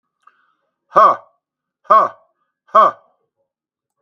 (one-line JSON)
{"exhalation_length": "4.0 s", "exhalation_amplitude": 32768, "exhalation_signal_mean_std_ratio": 0.3, "survey_phase": "beta (2021-08-13 to 2022-03-07)", "age": "65+", "gender": "Male", "wearing_mask": "No", "symptom_cough_any": true, "symptom_fatigue": true, "symptom_onset": "12 days", "smoker_status": "Never smoked", "respiratory_condition_asthma": false, "respiratory_condition_other": false, "recruitment_source": "REACT", "submission_delay": "2 days", "covid_test_result": "Negative", "covid_test_method": "RT-qPCR", "influenza_a_test_result": "Negative", "influenza_b_test_result": "Negative"}